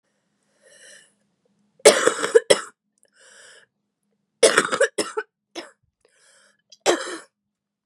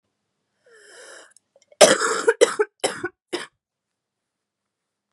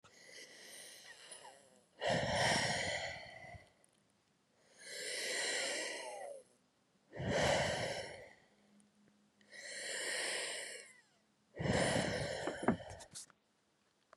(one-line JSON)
{"three_cough_length": "7.9 s", "three_cough_amplitude": 32768, "three_cough_signal_mean_std_ratio": 0.27, "cough_length": "5.1 s", "cough_amplitude": 32768, "cough_signal_mean_std_ratio": 0.27, "exhalation_length": "14.2 s", "exhalation_amplitude": 3958, "exhalation_signal_mean_std_ratio": 0.57, "survey_phase": "beta (2021-08-13 to 2022-03-07)", "age": "18-44", "gender": "Female", "wearing_mask": "No", "symptom_cough_any": true, "symptom_new_continuous_cough": true, "symptom_runny_or_blocked_nose": true, "symptom_shortness_of_breath": true, "symptom_sore_throat": true, "symptom_abdominal_pain": true, "symptom_fatigue": true, "symptom_fever_high_temperature": true, "symptom_change_to_sense_of_smell_or_taste": true, "symptom_loss_of_taste": true, "symptom_onset": "4 days", "smoker_status": "Never smoked", "respiratory_condition_asthma": false, "respiratory_condition_other": false, "recruitment_source": "Test and Trace", "submission_delay": "2 days", "covid_test_result": "Negative", "covid_test_method": "RT-qPCR"}